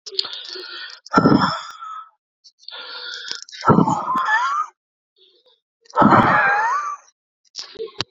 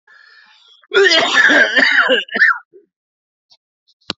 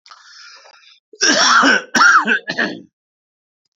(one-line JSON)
{"exhalation_length": "8.1 s", "exhalation_amplitude": 30046, "exhalation_signal_mean_std_ratio": 0.5, "cough_length": "4.2 s", "cough_amplitude": 32509, "cough_signal_mean_std_ratio": 0.52, "three_cough_length": "3.8 s", "three_cough_amplitude": 32768, "three_cough_signal_mean_std_ratio": 0.5, "survey_phase": "alpha (2021-03-01 to 2021-08-12)", "age": "45-64", "gender": "Male", "wearing_mask": "No", "symptom_none": true, "symptom_onset": "6 days", "smoker_status": "Prefer not to say", "respiratory_condition_asthma": false, "respiratory_condition_other": false, "recruitment_source": "REACT", "submission_delay": "1 day", "covid_test_result": "Negative", "covid_test_method": "RT-qPCR"}